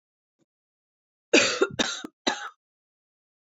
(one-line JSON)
{"three_cough_length": "3.4 s", "three_cough_amplitude": 18120, "three_cough_signal_mean_std_ratio": 0.31, "survey_phase": "alpha (2021-03-01 to 2021-08-12)", "age": "45-64", "gender": "Female", "wearing_mask": "No", "symptom_cough_any": true, "symptom_shortness_of_breath": true, "symptom_diarrhoea": true, "symptom_fatigue": true, "symptom_onset": "3 days", "smoker_status": "Ex-smoker", "respiratory_condition_asthma": false, "respiratory_condition_other": false, "recruitment_source": "Test and Trace", "submission_delay": "2 days", "covid_test_result": "Positive", "covid_test_method": "RT-qPCR", "covid_ct_value": 28.9, "covid_ct_gene": "ORF1ab gene", "covid_ct_mean": 29.8, "covid_viral_load": "170 copies/ml", "covid_viral_load_category": "Minimal viral load (< 10K copies/ml)"}